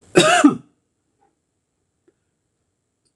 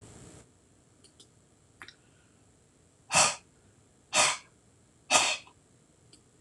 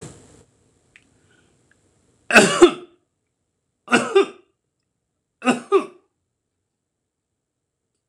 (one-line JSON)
{"cough_length": "3.2 s", "cough_amplitude": 26028, "cough_signal_mean_std_ratio": 0.27, "exhalation_length": "6.4 s", "exhalation_amplitude": 11990, "exhalation_signal_mean_std_ratio": 0.29, "three_cough_length": "8.1 s", "three_cough_amplitude": 26028, "three_cough_signal_mean_std_ratio": 0.25, "survey_phase": "beta (2021-08-13 to 2022-03-07)", "age": "65+", "gender": "Male", "wearing_mask": "No", "symptom_none": true, "smoker_status": "Never smoked", "respiratory_condition_asthma": false, "respiratory_condition_other": false, "recruitment_source": "REACT", "submission_delay": "3 days", "covid_test_result": "Negative", "covid_test_method": "RT-qPCR", "influenza_a_test_result": "Negative", "influenza_b_test_result": "Negative"}